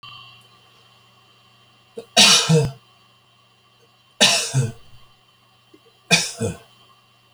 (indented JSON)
{
  "three_cough_length": "7.3 s",
  "three_cough_amplitude": 32768,
  "three_cough_signal_mean_std_ratio": 0.34,
  "survey_phase": "beta (2021-08-13 to 2022-03-07)",
  "age": "65+",
  "gender": "Male",
  "wearing_mask": "No",
  "symptom_none": true,
  "smoker_status": "Never smoked",
  "respiratory_condition_asthma": false,
  "respiratory_condition_other": false,
  "recruitment_source": "REACT",
  "submission_delay": "2 days",
  "covid_test_result": "Negative",
  "covid_test_method": "RT-qPCR"
}